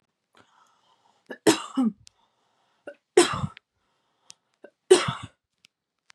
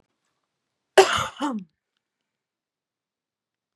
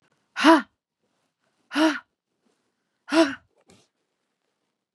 {"three_cough_length": "6.1 s", "three_cough_amplitude": 24117, "three_cough_signal_mean_std_ratio": 0.25, "cough_length": "3.8 s", "cough_amplitude": 32401, "cough_signal_mean_std_ratio": 0.22, "exhalation_length": "4.9 s", "exhalation_amplitude": 25577, "exhalation_signal_mean_std_ratio": 0.27, "survey_phase": "beta (2021-08-13 to 2022-03-07)", "age": "18-44", "gender": "Female", "wearing_mask": "No", "symptom_none": true, "smoker_status": "Never smoked", "respiratory_condition_asthma": false, "respiratory_condition_other": false, "recruitment_source": "REACT", "submission_delay": "1 day", "covid_test_result": "Negative", "covid_test_method": "RT-qPCR", "influenza_a_test_result": "Negative", "influenza_b_test_result": "Negative"}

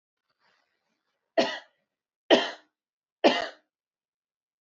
{"three_cough_length": "4.6 s", "three_cough_amplitude": 18859, "three_cough_signal_mean_std_ratio": 0.24, "survey_phase": "beta (2021-08-13 to 2022-03-07)", "age": "18-44", "gender": "Female", "wearing_mask": "No", "symptom_fatigue": true, "symptom_headache": true, "smoker_status": "Never smoked", "respiratory_condition_asthma": false, "respiratory_condition_other": false, "recruitment_source": "REACT", "submission_delay": "3 days", "covid_test_result": "Negative", "covid_test_method": "RT-qPCR", "influenza_a_test_result": "Negative", "influenza_b_test_result": "Negative"}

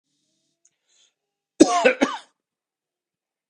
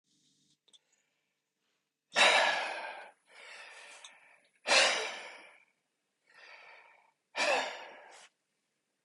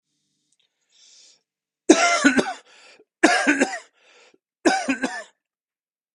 {"cough_length": "3.5 s", "cough_amplitude": 32768, "cough_signal_mean_std_ratio": 0.24, "exhalation_length": "9.0 s", "exhalation_amplitude": 8292, "exhalation_signal_mean_std_ratio": 0.34, "three_cough_length": "6.1 s", "three_cough_amplitude": 31778, "three_cough_signal_mean_std_ratio": 0.36, "survey_phase": "beta (2021-08-13 to 2022-03-07)", "age": "18-44", "gender": "Male", "wearing_mask": "No", "symptom_cough_any": true, "symptom_runny_or_blocked_nose": true, "symptom_sore_throat": true, "symptom_onset": "2 days", "smoker_status": "Never smoked", "respiratory_condition_asthma": true, "respiratory_condition_other": false, "recruitment_source": "REACT", "submission_delay": "2 days", "covid_test_result": "Negative", "covid_test_method": "RT-qPCR", "influenza_a_test_result": "Negative", "influenza_b_test_result": "Negative"}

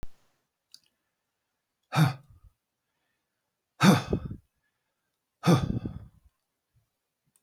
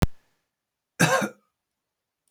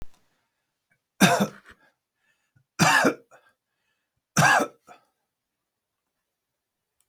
{"exhalation_length": "7.4 s", "exhalation_amplitude": 12517, "exhalation_signal_mean_std_ratio": 0.27, "cough_length": "2.3 s", "cough_amplitude": 19009, "cough_signal_mean_std_ratio": 0.31, "three_cough_length": "7.1 s", "three_cough_amplitude": 21425, "three_cough_signal_mean_std_ratio": 0.29, "survey_phase": "beta (2021-08-13 to 2022-03-07)", "age": "65+", "gender": "Male", "wearing_mask": "No", "symptom_none": true, "smoker_status": "Ex-smoker", "respiratory_condition_asthma": false, "respiratory_condition_other": false, "recruitment_source": "REACT", "submission_delay": "2 days", "covid_test_result": "Negative", "covid_test_method": "RT-qPCR", "influenza_a_test_result": "Negative", "influenza_b_test_result": "Negative"}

